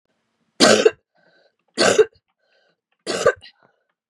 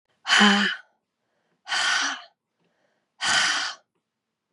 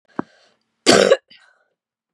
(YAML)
three_cough_length: 4.1 s
three_cough_amplitude: 32766
three_cough_signal_mean_std_ratio: 0.32
exhalation_length: 4.5 s
exhalation_amplitude: 23439
exhalation_signal_mean_std_ratio: 0.45
cough_length: 2.1 s
cough_amplitude: 32767
cough_signal_mean_std_ratio: 0.29
survey_phase: beta (2021-08-13 to 2022-03-07)
age: 45-64
gender: Female
wearing_mask: 'No'
symptom_cough_any: true
symptom_runny_or_blocked_nose: true
symptom_sore_throat: true
symptom_abdominal_pain: true
symptom_fatigue: true
symptom_headache: true
symptom_change_to_sense_of_smell_or_taste: true
symptom_onset: 3 days
smoker_status: Never smoked
respiratory_condition_asthma: false
respiratory_condition_other: false
recruitment_source: Test and Trace
submission_delay: 2 days
covid_test_result: Positive
covid_test_method: RT-qPCR
covid_ct_value: 15.3
covid_ct_gene: ORF1ab gene
covid_ct_mean: 15.6
covid_viral_load: 7700000 copies/ml
covid_viral_load_category: High viral load (>1M copies/ml)